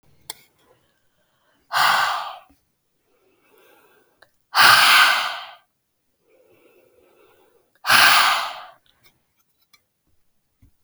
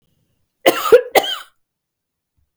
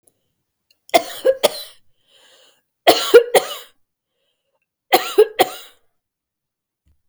{"exhalation_length": "10.8 s", "exhalation_amplitude": 32767, "exhalation_signal_mean_std_ratio": 0.34, "cough_length": "2.6 s", "cough_amplitude": 32768, "cough_signal_mean_std_ratio": 0.3, "three_cough_length": "7.1 s", "three_cough_amplitude": 32768, "three_cough_signal_mean_std_ratio": 0.28, "survey_phase": "beta (2021-08-13 to 2022-03-07)", "age": "45-64", "gender": "Female", "wearing_mask": "No", "symptom_none": true, "smoker_status": "Never smoked", "respiratory_condition_asthma": false, "respiratory_condition_other": false, "recruitment_source": "REACT", "submission_delay": "2 days", "covid_test_result": "Negative", "covid_test_method": "RT-qPCR", "influenza_a_test_result": "Negative", "influenza_b_test_result": "Negative"}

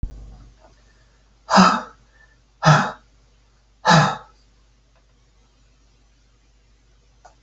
{"exhalation_length": "7.4 s", "exhalation_amplitude": 32767, "exhalation_signal_mean_std_ratio": 0.28, "survey_phase": "alpha (2021-03-01 to 2021-08-12)", "age": "65+", "gender": "Male", "wearing_mask": "No", "symptom_none": true, "smoker_status": "Never smoked", "respiratory_condition_asthma": false, "respiratory_condition_other": false, "recruitment_source": "REACT", "submission_delay": "1 day", "covid_test_result": "Negative", "covid_test_method": "RT-qPCR"}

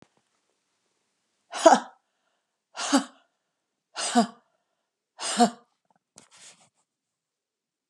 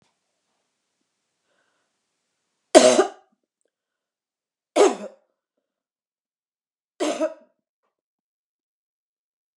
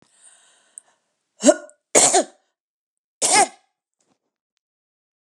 {"exhalation_length": "7.9 s", "exhalation_amplitude": 28064, "exhalation_signal_mean_std_ratio": 0.23, "three_cough_length": "9.6 s", "three_cough_amplitude": 32768, "three_cough_signal_mean_std_ratio": 0.2, "cough_length": "5.2 s", "cough_amplitude": 32768, "cough_signal_mean_std_ratio": 0.27, "survey_phase": "beta (2021-08-13 to 2022-03-07)", "age": "65+", "gender": "Female", "wearing_mask": "No", "symptom_none": true, "smoker_status": "Never smoked", "respiratory_condition_asthma": false, "respiratory_condition_other": false, "recruitment_source": "REACT", "submission_delay": "3 days", "covid_test_result": "Negative", "covid_test_method": "RT-qPCR", "influenza_a_test_result": "Negative", "influenza_b_test_result": "Negative"}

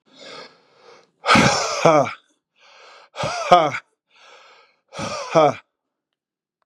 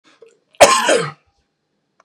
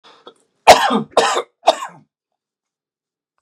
{"exhalation_length": "6.7 s", "exhalation_amplitude": 32768, "exhalation_signal_mean_std_ratio": 0.38, "cough_length": "2.0 s", "cough_amplitude": 32768, "cough_signal_mean_std_ratio": 0.35, "three_cough_length": "3.4 s", "three_cough_amplitude": 32768, "three_cough_signal_mean_std_ratio": 0.31, "survey_phase": "beta (2021-08-13 to 2022-03-07)", "age": "45-64", "gender": "Male", "wearing_mask": "No", "symptom_none": true, "smoker_status": "Ex-smoker", "respiratory_condition_asthma": false, "respiratory_condition_other": false, "recruitment_source": "Test and Trace", "submission_delay": "2 days", "covid_test_result": "Positive", "covid_test_method": "RT-qPCR", "covid_ct_value": 15.0, "covid_ct_gene": "ORF1ab gene"}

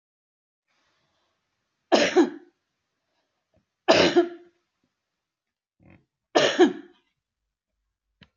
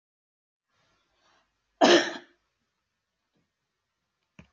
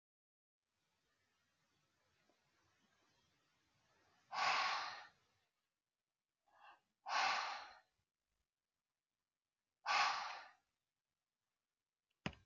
{"three_cough_length": "8.4 s", "three_cough_amplitude": 25907, "three_cough_signal_mean_std_ratio": 0.28, "cough_length": "4.5 s", "cough_amplitude": 17920, "cough_signal_mean_std_ratio": 0.19, "exhalation_length": "12.5 s", "exhalation_amplitude": 1994, "exhalation_signal_mean_std_ratio": 0.3, "survey_phase": "alpha (2021-03-01 to 2021-08-12)", "age": "45-64", "gender": "Female", "wearing_mask": "No", "symptom_none": true, "smoker_status": "Never smoked", "respiratory_condition_asthma": false, "respiratory_condition_other": false, "recruitment_source": "REACT", "submission_delay": "2 days", "covid_test_result": "Negative", "covid_test_method": "RT-qPCR"}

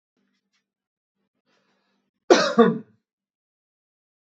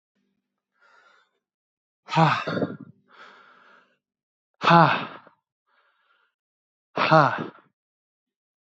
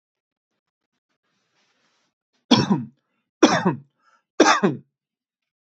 {"cough_length": "4.3 s", "cough_amplitude": 32768, "cough_signal_mean_std_ratio": 0.22, "exhalation_length": "8.6 s", "exhalation_amplitude": 28172, "exhalation_signal_mean_std_ratio": 0.28, "three_cough_length": "5.6 s", "three_cough_amplitude": 29449, "three_cough_signal_mean_std_ratio": 0.29, "survey_phase": "beta (2021-08-13 to 2022-03-07)", "age": "18-44", "gender": "Male", "wearing_mask": "No", "symptom_none": true, "smoker_status": "Ex-smoker", "respiratory_condition_asthma": false, "respiratory_condition_other": false, "recruitment_source": "REACT", "submission_delay": "1 day", "covid_test_result": "Negative", "covid_test_method": "RT-qPCR", "influenza_a_test_result": "Negative", "influenza_b_test_result": "Negative"}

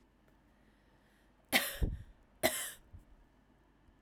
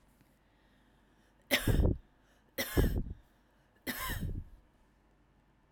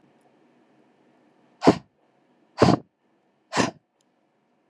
{"cough_length": "4.0 s", "cough_amplitude": 7009, "cough_signal_mean_std_ratio": 0.32, "three_cough_length": "5.7 s", "three_cough_amplitude": 6194, "three_cough_signal_mean_std_ratio": 0.39, "exhalation_length": "4.7 s", "exhalation_amplitude": 26964, "exhalation_signal_mean_std_ratio": 0.22, "survey_phase": "alpha (2021-03-01 to 2021-08-12)", "age": "18-44", "gender": "Female", "wearing_mask": "No", "symptom_none": true, "smoker_status": "Never smoked", "respiratory_condition_asthma": false, "respiratory_condition_other": false, "recruitment_source": "REACT", "submission_delay": "3 days", "covid_test_result": "Negative", "covid_test_method": "RT-qPCR"}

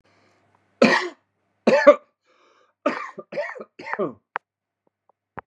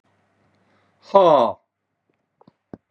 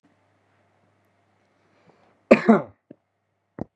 {"three_cough_length": "5.5 s", "three_cough_amplitude": 32006, "three_cough_signal_mean_std_ratio": 0.29, "exhalation_length": "2.9 s", "exhalation_amplitude": 32258, "exhalation_signal_mean_std_ratio": 0.29, "cough_length": "3.8 s", "cough_amplitude": 32767, "cough_signal_mean_std_ratio": 0.19, "survey_phase": "beta (2021-08-13 to 2022-03-07)", "age": "45-64", "gender": "Male", "wearing_mask": "No", "symptom_shortness_of_breath": true, "symptom_fatigue": true, "symptom_headache": true, "smoker_status": "Never smoked", "respiratory_condition_asthma": false, "respiratory_condition_other": false, "recruitment_source": "Test and Trace", "submission_delay": "3 days", "covid_test_method": "RT-qPCR", "covid_ct_value": 30.8, "covid_ct_gene": "N gene", "covid_ct_mean": 31.7, "covid_viral_load": "40 copies/ml", "covid_viral_load_category": "Minimal viral load (< 10K copies/ml)"}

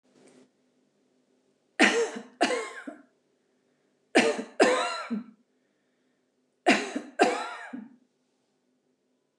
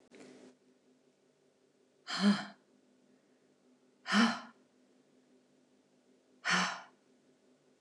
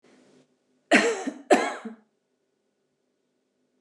{"three_cough_length": "9.4 s", "three_cough_amplitude": 14634, "three_cough_signal_mean_std_ratio": 0.35, "exhalation_length": "7.8 s", "exhalation_amplitude": 5015, "exhalation_signal_mean_std_ratio": 0.29, "cough_length": "3.8 s", "cough_amplitude": 21060, "cough_signal_mean_std_ratio": 0.29, "survey_phase": "alpha (2021-03-01 to 2021-08-12)", "age": "65+", "gender": "Female", "wearing_mask": "No", "symptom_none": true, "smoker_status": "Ex-smoker", "respiratory_condition_asthma": false, "respiratory_condition_other": false, "recruitment_source": "REACT", "submission_delay": "2 days", "covid_test_result": "Negative", "covid_test_method": "RT-qPCR"}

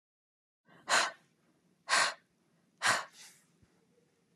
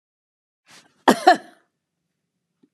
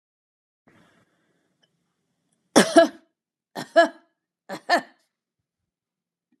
{"exhalation_length": "4.4 s", "exhalation_amplitude": 6300, "exhalation_signal_mean_std_ratio": 0.31, "cough_length": "2.7 s", "cough_amplitude": 32767, "cough_signal_mean_std_ratio": 0.2, "three_cough_length": "6.4 s", "three_cough_amplitude": 31119, "three_cough_signal_mean_std_ratio": 0.22, "survey_phase": "beta (2021-08-13 to 2022-03-07)", "age": "45-64", "gender": "Female", "wearing_mask": "No", "symptom_none": true, "smoker_status": "Never smoked", "respiratory_condition_asthma": false, "respiratory_condition_other": false, "recruitment_source": "REACT", "submission_delay": "2 days", "covid_test_result": "Negative", "covid_test_method": "RT-qPCR"}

